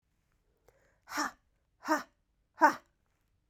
{"exhalation_length": "3.5 s", "exhalation_amplitude": 10863, "exhalation_signal_mean_std_ratio": 0.24, "survey_phase": "beta (2021-08-13 to 2022-03-07)", "age": "18-44", "gender": "Female", "wearing_mask": "No", "symptom_cough_any": true, "symptom_runny_or_blocked_nose": true, "symptom_fatigue": true, "symptom_headache": true, "symptom_change_to_sense_of_smell_or_taste": true, "symptom_loss_of_taste": true, "symptom_onset": "3 days", "smoker_status": "Never smoked", "respiratory_condition_asthma": false, "respiratory_condition_other": false, "recruitment_source": "Test and Trace", "submission_delay": "2 days", "covid_test_result": "Positive", "covid_test_method": "ePCR"}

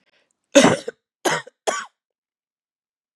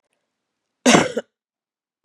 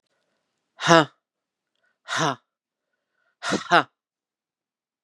{"three_cough_length": "3.2 s", "three_cough_amplitude": 32759, "three_cough_signal_mean_std_ratio": 0.28, "cough_length": "2.0 s", "cough_amplitude": 32725, "cough_signal_mean_std_ratio": 0.27, "exhalation_length": "5.0 s", "exhalation_amplitude": 32689, "exhalation_signal_mean_std_ratio": 0.24, "survey_phase": "beta (2021-08-13 to 2022-03-07)", "age": "45-64", "gender": "Female", "wearing_mask": "No", "symptom_cough_any": true, "symptom_runny_or_blocked_nose": true, "smoker_status": "Ex-smoker", "respiratory_condition_asthma": false, "respiratory_condition_other": false, "recruitment_source": "Test and Trace", "submission_delay": "2 days", "covid_test_result": "Positive", "covid_test_method": "RT-qPCR", "covid_ct_value": 12.6, "covid_ct_gene": "ORF1ab gene"}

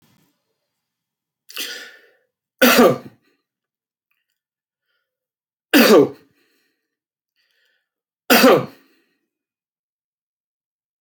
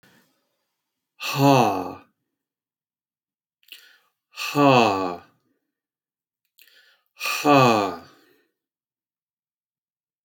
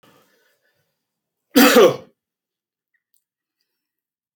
{"three_cough_length": "11.0 s", "three_cough_amplitude": 32653, "three_cough_signal_mean_std_ratio": 0.26, "exhalation_length": "10.2 s", "exhalation_amplitude": 23684, "exhalation_signal_mean_std_ratio": 0.33, "cough_length": "4.4 s", "cough_amplitude": 32045, "cough_signal_mean_std_ratio": 0.24, "survey_phase": "alpha (2021-03-01 to 2021-08-12)", "age": "65+", "gender": "Male", "wearing_mask": "No", "symptom_none": true, "smoker_status": "Ex-smoker", "respiratory_condition_asthma": false, "respiratory_condition_other": false, "recruitment_source": "REACT", "submission_delay": "2 days", "covid_test_result": "Negative", "covid_test_method": "RT-qPCR"}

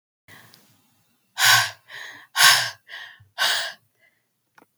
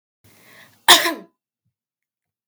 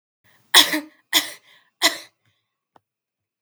{"exhalation_length": "4.8 s", "exhalation_amplitude": 32311, "exhalation_signal_mean_std_ratio": 0.35, "cough_length": "2.5 s", "cough_amplitude": 32768, "cough_signal_mean_std_ratio": 0.22, "three_cough_length": "3.4 s", "three_cough_amplitude": 32768, "three_cough_signal_mean_std_ratio": 0.26, "survey_phase": "beta (2021-08-13 to 2022-03-07)", "age": "18-44", "gender": "Female", "wearing_mask": "No", "symptom_none": true, "smoker_status": "Never smoked", "respiratory_condition_asthma": false, "respiratory_condition_other": false, "recruitment_source": "Test and Trace", "submission_delay": "1 day", "covid_test_result": "Positive", "covid_test_method": "LFT"}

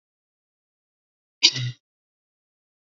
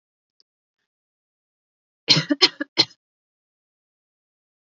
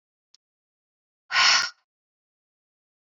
{"cough_length": "3.0 s", "cough_amplitude": 29933, "cough_signal_mean_std_ratio": 0.18, "three_cough_length": "4.6 s", "three_cough_amplitude": 29108, "three_cough_signal_mean_std_ratio": 0.19, "exhalation_length": "3.2 s", "exhalation_amplitude": 16823, "exhalation_signal_mean_std_ratio": 0.26, "survey_phase": "beta (2021-08-13 to 2022-03-07)", "age": "18-44", "gender": "Female", "wearing_mask": "No", "symptom_none": true, "smoker_status": "Never smoked", "respiratory_condition_asthma": false, "respiratory_condition_other": false, "recruitment_source": "REACT", "submission_delay": "1 day", "covid_test_result": "Negative", "covid_test_method": "RT-qPCR", "influenza_a_test_result": "Negative", "influenza_b_test_result": "Negative"}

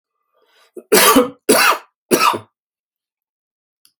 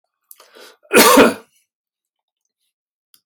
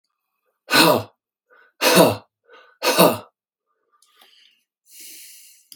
{"three_cough_length": "4.0 s", "three_cough_amplitude": 32768, "three_cough_signal_mean_std_ratio": 0.39, "cough_length": "3.3 s", "cough_amplitude": 32768, "cough_signal_mean_std_ratio": 0.29, "exhalation_length": "5.8 s", "exhalation_amplitude": 30712, "exhalation_signal_mean_std_ratio": 0.33, "survey_phase": "beta (2021-08-13 to 2022-03-07)", "age": "65+", "gender": "Male", "wearing_mask": "No", "symptom_none": true, "smoker_status": "Never smoked", "respiratory_condition_asthma": false, "respiratory_condition_other": false, "recruitment_source": "REACT", "submission_delay": "1 day", "covid_test_result": "Negative", "covid_test_method": "RT-qPCR"}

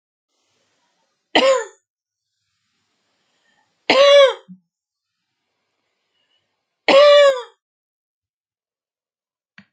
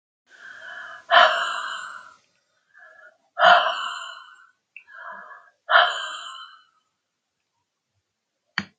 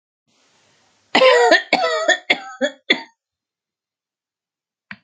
{"three_cough_length": "9.7 s", "three_cough_amplitude": 29635, "three_cough_signal_mean_std_ratio": 0.3, "exhalation_length": "8.8 s", "exhalation_amplitude": 29788, "exhalation_signal_mean_std_ratio": 0.33, "cough_length": "5.0 s", "cough_amplitude": 29683, "cough_signal_mean_std_ratio": 0.37, "survey_phase": "alpha (2021-03-01 to 2021-08-12)", "age": "65+", "gender": "Female", "wearing_mask": "No", "symptom_none": true, "smoker_status": "Never smoked", "respiratory_condition_asthma": false, "respiratory_condition_other": false, "recruitment_source": "REACT", "submission_delay": "1 day", "covid_test_result": "Negative", "covid_test_method": "RT-qPCR"}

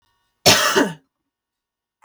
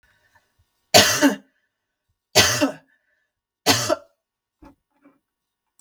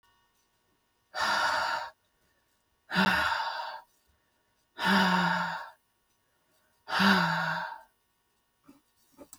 {"cough_length": "2.0 s", "cough_amplitude": 32768, "cough_signal_mean_std_ratio": 0.36, "three_cough_length": "5.8 s", "three_cough_amplitude": 32768, "three_cough_signal_mean_std_ratio": 0.31, "exhalation_length": "9.4 s", "exhalation_amplitude": 10018, "exhalation_signal_mean_std_ratio": 0.48, "survey_phase": "beta (2021-08-13 to 2022-03-07)", "age": "18-44", "gender": "Female", "wearing_mask": "No", "symptom_runny_or_blocked_nose": true, "symptom_sore_throat": true, "symptom_fatigue": true, "symptom_onset": "8 days", "smoker_status": "Ex-smoker", "respiratory_condition_asthma": false, "respiratory_condition_other": false, "recruitment_source": "REACT", "submission_delay": "2 days", "covid_test_result": "Negative", "covid_test_method": "RT-qPCR", "influenza_a_test_result": "Unknown/Void", "influenza_b_test_result": "Unknown/Void"}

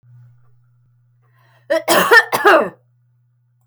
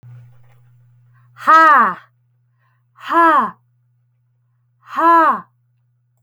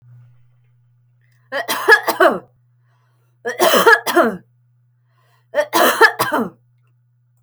{"cough_length": "3.7 s", "cough_amplitude": 31613, "cough_signal_mean_std_ratio": 0.37, "exhalation_length": "6.2 s", "exhalation_amplitude": 29472, "exhalation_signal_mean_std_ratio": 0.4, "three_cough_length": "7.4 s", "three_cough_amplitude": 32588, "three_cough_signal_mean_std_ratio": 0.41, "survey_phase": "alpha (2021-03-01 to 2021-08-12)", "age": "18-44", "gender": "Female", "wearing_mask": "No", "symptom_none": true, "smoker_status": "Never smoked", "respiratory_condition_asthma": false, "respiratory_condition_other": false, "recruitment_source": "REACT", "submission_delay": "1 day", "covid_test_result": "Negative", "covid_test_method": "RT-qPCR"}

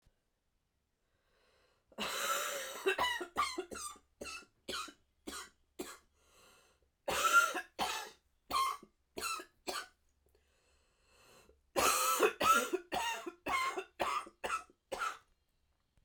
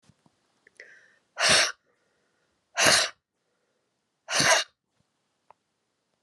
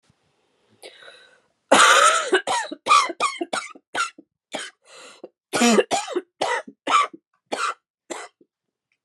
{"three_cough_length": "16.0 s", "three_cough_amplitude": 5056, "three_cough_signal_mean_std_ratio": 0.46, "exhalation_length": "6.2 s", "exhalation_amplitude": 18493, "exhalation_signal_mean_std_ratio": 0.31, "cough_length": "9.0 s", "cough_amplitude": 29164, "cough_signal_mean_std_ratio": 0.43, "survey_phase": "alpha (2021-03-01 to 2021-08-12)", "age": "45-64", "gender": "Female", "wearing_mask": "No", "symptom_cough_any": true, "symptom_new_continuous_cough": true, "symptom_fatigue": true, "symptom_headache": true, "smoker_status": "Never smoked", "respiratory_condition_asthma": false, "respiratory_condition_other": false, "recruitment_source": "Test and Trace", "submission_delay": "2 days", "covid_test_result": "Positive", "covid_test_method": "RT-qPCR", "covid_ct_value": 27.8, "covid_ct_gene": "ORF1ab gene", "covid_ct_mean": 28.5, "covid_viral_load": "460 copies/ml", "covid_viral_load_category": "Minimal viral load (< 10K copies/ml)"}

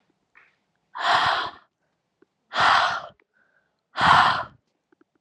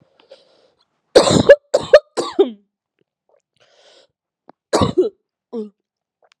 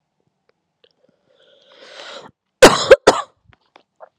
{"exhalation_length": "5.2 s", "exhalation_amplitude": 25704, "exhalation_signal_mean_std_ratio": 0.41, "three_cough_length": "6.4 s", "three_cough_amplitude": 32768, "three_cough_signal_mean_std_ratio": 0.28, "cough_length": "4.2 s", "cough_amplitude": 32768, "cough_signal_mean_std_ratio": 0.22, "survey_phase": "alpha (2021-03-01 to 2021-08-12)", "age": "18-44", "gender": "Female", "wearing_mask": "No", "symptom_loss_of_taste": true, "smoker_status": "Current smoker (1 to 10 cigarettes per day)", "respiratory_condition_asthma": false, "respiratory_condition_other": false, "recruitment_source": "Test and Trace", "submission_delay": "1 day", "covid_test_result": "Positive", "covid_test_method": "RT-qPCR", "covid_ct_value": 14.0, "covid_ct_gene": "ORF1ab gene", "covid_ct_mean": 14.3, "covid_viral_load": "21000000 copies/ml", "covid_viral_load_category": "High viral load (>1M copies/ml)"}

